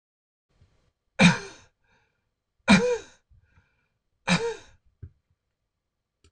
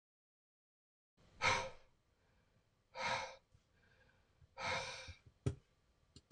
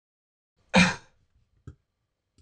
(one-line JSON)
{"three_cough_length": "6.3 s", "three_cough_amplitude": 20894, "three_cough_signal_mean_std_ratio": 0.26, "exhalation_length": "6.3 s", "exhalation_amplitude": 2796, "exhalation_signal_mean_std_ratio": 0.34, "cough_length": "2.4 s", "cough_amplitude": 19181, "cough_signal_mean_std_ratio": 0.23, "survey_phase": "beta (2021-08-13 to 2022-03-07)", "age": "45-64", "gender": "Male", "wearing_mask": "No", "symptom_none": true, "smoker_status": "Ex-smoker", "respiratory_condition_asthma": false, "respiratory_condition_other": false, "recruitment_source": "REACT", "submission_delay": "1 day", "covid_test_result": "Negative", "covid_test_method": "RT-qPCR"}